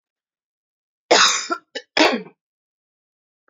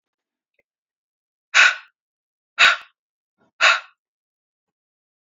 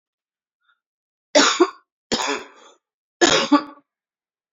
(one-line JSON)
{"cough_length": "3.5 s", "cough_amplitude": 30108, "cough_signal_mean_std_ratio": 0.32, "exhalation_length": "5.2 s", "exhalation_amplitude": 29152, "exhalation_signal_mean_std_ratio": 0.25, "three_cough_length": "4.5 s", "three_cough_amplitude": 30298, "three_cough_signal_mean_std_ratio": 0.34, "survey_phase": "beta (2021-08-13 to 2022-03-07)", "age": "45-64", "gender": "Female", "wearing_mask": "No", "symptom_cough_any": true, "symptom_runny_or_blocked_nose": true, "symptom_sore_throat": true, "symptom_fatigue": true, "symptom_headache": true, "symptom_other": true, "symptom_onset": "2 days", "smoker_status": "Ex-smoker", "respiratory_condition_asthma": false, "respiratory_condition_other": false, "recruitment_source": "Test and Trace", "submission_delay": "2 days", "covid_test_result": "Positive", "covid_test_method": "RT-qPCR", "covid_ct_value": 26.3, "covid_ct_gene": "ORF1ab gene", "covid_ct_mean": 26.4, "covid_viral_load": "2300 copies/ml", "covid_viral_load_category": "Minimal viral load (< 10K copies/ml)"}